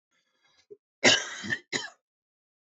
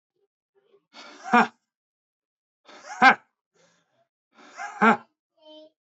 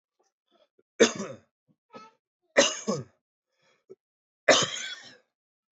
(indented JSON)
{
  "cough_length": "2.6 s",
  "cough_amplitude": 14553,
  "cough_signal_mean_std_ratio": 0.29,
  "exhalation_length": "5.8 s",
  "exhalation_amplitude": 20610,
  "exhalation_signal_mean_std_ratio": 0.23,
  "three_cough_length": "5.7 s",
  "three_cough_amplitude": 18111,
  "three_cough_signal_mean_std_ratio": 0.27,
  "survey_phase": "beta (2021-08-13 to 2022-03-07)",
  "age": "18-44",
  "gender": "Male",
  "wearing_mask": "No",
  "symptom_none": true,
  "symptom_onset": "2 days",
  "smoker_status": "Ex-smoker",
  "respiratory_condition_asthma": false,
  "respiratory_condition_other": false,
  "recruitment_source": "Test and Trace",
  "submission_delay": "2 days",
  "covid_test_result": "Negative",
  "covid_test_method": "RT-qPCR"
}